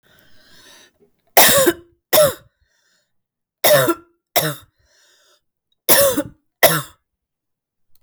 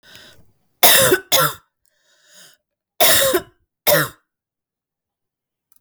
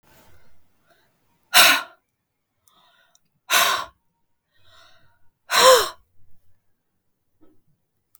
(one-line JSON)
{"three_cough_length": "8.0 s", "three_cough_amplitude": 32768, "three_cough_signal_mean_std_ratio": 0.36, "cough_length": "5.8 s", "cough_amplitude": 32768, "cough_signal_mean_std_ratio": 0.38, "exhalation_length": "8.2 s", "exhalation_amplitude": 32768, "exhalation_signal_mean_std_ratio": 0.27, "survey_phase": "alpha (2021-03-01 to 2021-08-12)", "age": "45-64", "gender": "Female", "wearing_mask": "No", "symptom_cough_any": true, "symptom_new_continuous_cough": true, "symptom_fatigue": true, "symptom_fever_high_temperature": true, "symptom_headache": true, "symptom_change_to_sense_of_smell_or_taste": true, "symptom_loss_of_taste": true, "symptom_onset": "4 days", "smoker_status": "Never smoked", "respiratory_condition_asthma": false, "respiratory_condition_other": false, "recruitment_source": "Test and Trace", "submission_delay": "3 days", "covid_test_result": "Positive", "covid_test_method": "RT-qPCR", "covid_ct_value": 20.4, "covid_ct_gene": "N gene"}